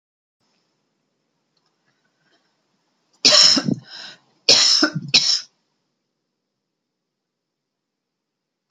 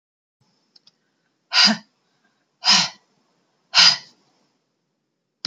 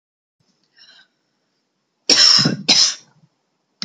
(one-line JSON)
{"three_cough_length": "8.7 s", "three_cough_amplitude": 32395, "three_cough_signal_mean_std_ratio": 0.29, "exhalation_length": "5.5 s", "exhalation_amplitude": 31883, "exhalation_signal_mean_std_ratio": 0.27, "cough_length": "3.8 s", "cough_amplitude": 32214, "cough_signal_mean_std_ratio": 0.35, "survey_phase": "beta (2021-08-13 to 2022-03-07)", "age": "45-64", "gender": "Female", "wearing_mask": "No", "symptom_runny_or_blocked_nose": true, "symptom_sore_throat": true, "symptom_fatigue": true, "symptom_onset": "3 days", "smoker_status": "Never smoked", "respiratory_condition_asthma": false, "respiratory_condition_other": false, "recruitment_source": "Test and Trace", "submission_delay": "2 days", "covid_test_method": "RT-qPCR", "covid_ct_value": 32.5, "covid_ct_gene": "ORF1ab gene"}